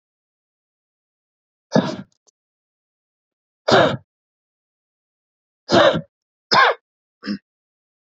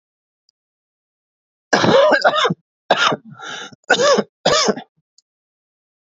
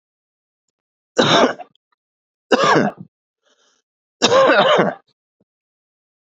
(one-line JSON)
{"exhalation_length": "8.2 s", "exhalation_amplitude": 28384, "exhalation_signal_mean_std_ratio": 0.27, "cough_length": "6.1 s", "cough_amplitude": 31743, "cough_signal_mean_std_ratio": 0.44, "three_cough_length": "6.3 s", "three_cough_amplitude": 32767, "three_cough_signal_mean_std_ratio": 0.39, "survey_phase": "beta (2021-08-13 to 2022-03-07)", "age": "18-44", "gender": "Male", "wearing_mask": "No", "symptom_cough_any": true, "symptom_runny_or_blocked_nose": true, "symptom_shortness_of_breath": true, "symptom_onset": "9 days", "smoker_status": "Current smoker (1 to 10 cigarettes per day)", "respiratory_condition_asthma": true, "respiratory_condition_other": true, "recruitment_source": "REACT", "submission_delay": "4 days", "covid_test_result": "Negative", "covid_test_method": "RT-qPCR", "influenza_a_test_result": "Negative", "influenza_b_test_result": "Negative"}